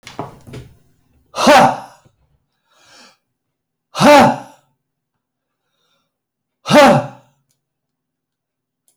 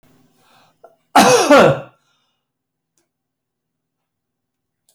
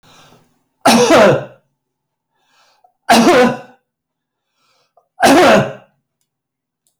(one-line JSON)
{"exhalation_length": "9.0 s", "exhalation_amplitude": 32768, "exhalation_signal_mean_std_ratio": 0.31, "cough_length": "4.9 s", "cough_amplitude": 32336, "cough_signal_mean_std_ratio": 0.29, "three_cough_length": "7.0 s", "three_cough_amplitude": 31103, "three_cough_signal_mean_std_ratio": 0.42, "survey_phase": "alpha (2021-03-01 to 2021-08-12)", "age": "65+", "gender": "Male", "wearing_mask": "No", "symptom_none": true, "smoker_status": "Ex-smoker", "respiratory_condition_asthma": false, "respiratory_condition_other": false, "recruitment_source": "REACT", "submission_delay": "2 days", "covid_test_result": "Negative", "covid_test_method": "RT-qPCR"}